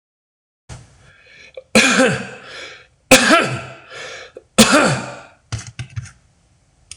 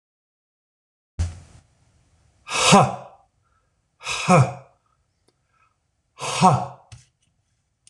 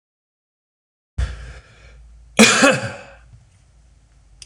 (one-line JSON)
{"three_cough_length": "7.0 s", "three_cough_amplitude": 26028, "three_cough_signal_mean_std_ratio": 0.39, "exhalation_length": "7.9 s", "exhalation_amplitude": 26027, "exhalation_signal_mean_std_ratio": 0.3, "cough_length": "4.5 s", "cough_amplitude": 26028, "cough_signal_mean_std_ratio": 0.3, "survey_phase": "beta (2021-08-13 to 2022-03-07)", "age": "45-64", "gender": "Male", "wearing_mask": "No", "symptom_none": true, "smoker_status": "Ex-smoker", "respiratory_condition_asthma": false, "respiratory_condition_other": false, "recruitment_source": "REACT", "submission_delay": "1 day", "covid_test_result": "Negative", "covid_test_method": "RT-qPCR"}